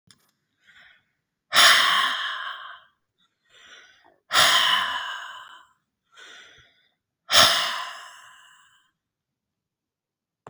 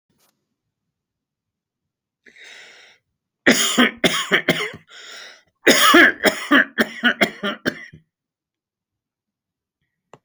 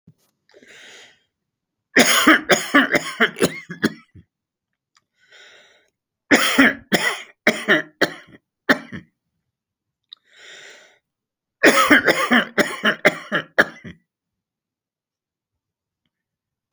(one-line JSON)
{"exhalation_length": "10.5 s", "exhalation_amplitude": 30393, "exhalation_signal_mean_std_ratio": 0.36, "cough_length": "10.2 s", "cough_amplitude": 30954, "cough_signal_mean_std_ratio": 0.35, "three_cough_length": "16.7 s", "three_cough_amplitude": 32500, "three_cough_signal_mean_std_ratio": 0.35, "survey_phase": "alpha (2021-03-01 to 2021-08-12)", "age": "65+", "gender": "Male", "wearing_mask": "No", "symptom_none": true, "smoker_status": "Ex-smoker", "respiratory_condition_asthma": false, "respiratory_condition_other": false, "recruitment_source": "REACT", "submission_delay": "2 days", "covid_test_result": "Negative", "covid_test_method": "RT-qPCR"}